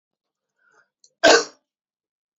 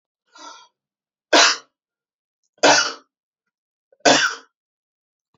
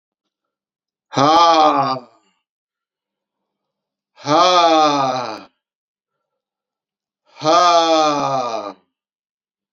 {
  "cough_length": "2.4 s",
  "cough_amplitude": 29133,
  "cough_signal_mean_std_ratio": 0.22,
  "three_cough_length": "5.4 s",
  "three_cough_amplitude": 32768,
  "three_cough_signal_mean_std_ratio": 0.3,
  "exhalation_length": "9.7 s",
  "exhalation_amplitude": 30829,
  "exhalation_signal_mean_std_ratio": 0.46,
  "survey_phase": "beta (2021-08-13 to 2022-03-07)",
  "age": "18-44",
  "gender": "Male",
  "wearing_mask": "No",
  "symptom_cough_any": true,
  "symptom_runny_or_blocked_nose": true,
  "symptom_sore_throat": true,
  "smoker_status": "Ex-smoker",
  "respiratory_condition_asthma": false,
  "respiratory_condition_other": false,
  "recruitment_source": "Test and Trace",
  "submission_delay": "2 days",
  "covid_test_result": "Positive",
  "covid_test_method": "RT-qPCR",
  "covid_ct_value": 25.1,
  "covid_ct_gene": "N gene"
}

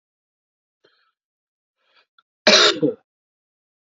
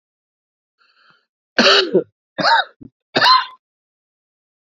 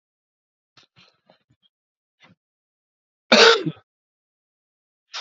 {
  "exhalation_length": "3.9 s",
  "exhalation_amplitude": 31296,
  "exhalation_signal_mean_std_ratio": 0.24,
  "three_cough_length": "4.7 s",
  "three_cough_amplitude": 30871,
  "three_cough_signal_mean_std_ratio": 0.36,
  "cough_length": "5.2 s",
  "cough_amplitude": 31513,
  "cough_signal_mean_std_ratio": 0.2,
  "survey_phase": "beta (2021-08-13 to 2022-03-07)",
  "age": "65+",
  "gender": "Male",
  "wearing_mask": "No",
  "symptom_new_continuous_cough": true,
  "symptom_runny_or_blocked_nose": true,
  "symptom_sore_throat": true,
  "symptom_fatigue": true,
  "symptom_fever_high_temperature": true,
  "symptom_headache": true,
  "symptom_change_to_sense_of_smell_or_taste": true,
  "symptom_loss_of_taste": true,
  "symptom_onset": "4 days",
  "smoker_status": "Never smoked",
  "respiratory_condition_asthma": false,
  "respiratory_condition_other": false,
  "recruitment_source": "Test and Trace",
  "submission_delay": "2 days",
  "covid_test_result": "Positive",
  "covid_test_method": "RT-qPCR",
  "covid_ct_value": 23.8,
  "covid_ct_gene": "ORF1ab gene"
}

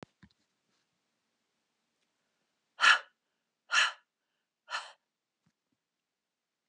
{
  "exhalation_length": "6.7 s",
  "exhalation_amplitude": 11094,
  "exhalation_signal_mean_std_ratio": 0.19,
  "survey_phase": "beta (2021-08-13 to 2022-03-07)",
  "age": "65+",
  "gender": "Female",
  "wearing_mask": "No",
  "symptom_none": true,
  "smoker_status": "Never smoked",
  "respiratory_condition_asthma": false,
  "respiratory_condition_other": false,
  "recruitment_source": "REACT",
  "submission_delay": "1 day",
  "covid_test_result": "Negative",
  "covid_test_method": "RT-qPCR"
}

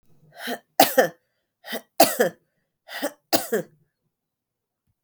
{
  "three_cough_length": "5.0 s",
  "three_cough_amplitude": 31903,
  "three_cough_signal_mean_std_ratio": 0.3,
  "survey_phase": "beta (2021-08-13 to 2022-03-07)",
  "age": "45-64",
  "gender": "Female",
  "wearing_mask": "No",
  "symptom_cough_any": true,
  "symptom_runny_or_blocked_nose": true,
  "symptom_sore_throat": true,
  "symptom_fatigue": true,
  "symptom_other": true,
  "symptom_onset": "4 days",
  "smoker_status": "Never smoked",
  "respiratory_condition_asthma": false,
  "respiratory_condition_other": false,
  "recruitment_source": "Test and Trace",
  "submission_delay": "1 day",
  "covid_test_result": "Positive",
  "covid_test_method": "RT-qPCR",
  "covid_ct_value": 21.9,
  "covid_ct_gene": "ORF1ab gene"
}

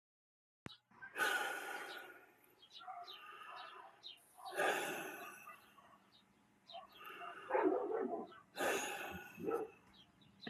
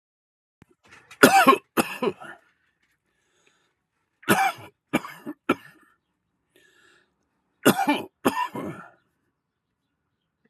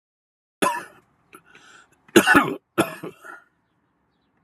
{
  "exhalation_length": "10.5 s",
  "exhalation_amplitude": 2070,
  "exhalation_signal_mean_std_ratio": 0.54,
  "three_cough_length": "10.5 s",
  "three_cough_amplitude": 32768,
  "three_cough_signal_mean_std_ratio": 0.28,
  "cough_length": "4.4 s",
  "cough_amplitude": 32354,
  "cough_signal_mean_std_ratio": 0.28,
  "survey_phase": "alpha (2021-03-01 to 2021-08-12)",
  "age": "65+",
  "gender": "Male",
  "wearing_mask": "No",
  "symptom_none": true,
  "smoker_status": "Never smoked",
  "respiratory_condition_asthma": true,
  "respiratory_condition_other": false,
  "recruitment_source": "REACT",
  "submission_delay": "3 days",
  "covid_test_result": "Negative",
  "covid_test_method": "RT-qPCR"
}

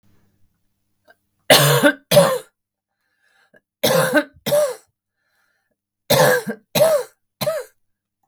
{
  "three_cough_length": "8.3 s",
  "three_cough_amplitude": 32768,
  "three_cough_signal_mean_std_ratio": 0.42,
  "survey_phase": "beta (2021-08-13 to 2022-03-07)",
  "age": "18-44",
  "gender": "Female",
  "wearing_mask": "No",
  "symptom_none": true,
  "smoker_status": "Current smoker (1 to 10 cigarettes per day)",
  "respiratory_condition_asthma": false,
  "respiratory_condition_other": false,
  "recruitment_source": "REACT",
  "submission_delay": "6 days",
  "covid_test_result": "Negative",
  "covid_test_method": "RT-qPCR"
}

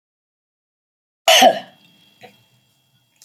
{
  "cough_length": "3.2 s",
  "cough_amplitude": 32056,
  "cough_signal_mean_std_ratio": 0.25,
  "survey_phase": "alpha (2021-03-01 to 2021-08-12)",
  "age": "65+",
  "gender": "Female",
  "wearing_mask": "No",
  "symptom_none": true,
  "smoker_status": "Never smoked",
  "respiratory_condition_asthma": false,
  "respiratory_condition_other": false,
  "recruitment_source": "REACT",
  "submission_delay": "2 days",
  "covid_test_result": "Negative",
  "covid_test_method": "RT-qPCR"
}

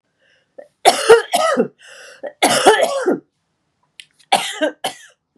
{
  "three_cough_length": "5.4 s",
  "three_cough_amplitude": 32768,
  "three_cough_signal_mean_std_ratio": 0.44,
  "survey_phase": "beta (2021-08-13 to 2022-03-07)",
  "age": "45-64",
  "gender": "Female",
  "wearing_mask": "No",
  "symptom_cough_any": true,
  "symptom_runny_or_blocked_nose": true,
  "smoker_status": "Never smoked",
  "respiratory_condition_asthma": false,
  "respiratory_condition_other": false,
  "recruitment_source": "Test and Trace",
  "submission_delay": "1 day",
  "covid_test_result": "Positive",
  "covid_test_method": "RT-qPCR"
}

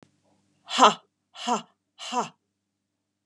{
  "exhalation_length": "3.3 s",
  "exhalation_amplitude": 24877,
  "exhalation_signal_mean_std_ratio": 0.26,
  "survey_phase": "beta (2021-08-13 to 2022-03-07)",
  "age": "45-64",
  "gender": "Female",
  "wearing_mask": "No",
  "symptom_none": true,
  "symptom_onset": "12 days",
  "smoker_status": "Never smoked",
  "respiratory_condition_asthma": false,
  "respiratory_condition_other": false,
  "recruitment_source": "REACT",
  "submission_delay": "1 day",
  "covid_test_result": "Negative",
  "covid_test_method": "RT-qPCR",
  "influenza_a_test_result": "Negative",
  "influenza_b_test_result": "Negative"
}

